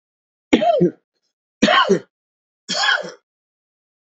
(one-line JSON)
{"three_cough_length": "4.2 s", "three_cough_amplitude": 27395, "three_cough_signal_mean_std_ratio": 0.4, "survey_phase": "beta (2021-08-13 to 2022-03-07)", "age": "45-64", "gender": "Male", "wearing_mask": "No", "symptom_cough_any": true, "symptom_fatigue": true, "smoker_status": "Ex-smoker", "respiratory_condition_asthma": false, "respiratory_condition_other": false, "recruitment_source": "Test and Trace", "submission_delay": "2 days", "covid_test_result": "Positive", "covid_test_method": "RT-qPCR", "covid_ct_value": 28.6, "covid_ct_gene": "ORF1ab gene"}